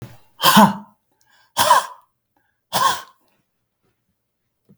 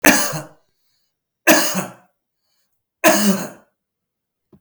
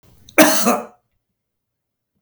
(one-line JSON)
{"exhalation_length": "4.8 s", "exhalation_amplitude": 32768, "exhalation_signal_mean_std_ratio": 0.32, "three_cough_length": "4.6 s", "three_cough_amplitude": 32768, "three_cough_signal_mean_std_ratio": 0.38, "cough_length": "2.2 s", "cough_amplitude": 32768, "cough_signal_mean_std_ratio": 0.34, "survey_phase": "beta (2021-08-13 to 2022-03-07)", "age": "45-64", "gender": "Male", "wearing_mask": "No", "symptom_none": true, "smoker_status": "Never smoked", "respiratory_condition_asthma": true, "respiratory_condition_other": false, "recruitment_source": "REACT", "submission_delay": "3 days", "covid_test_result": "Negative", "covid_test_method": "RT-qPCR", "influenza_a_test_result": "Negative", "influenza_b_test_result": "Negative"}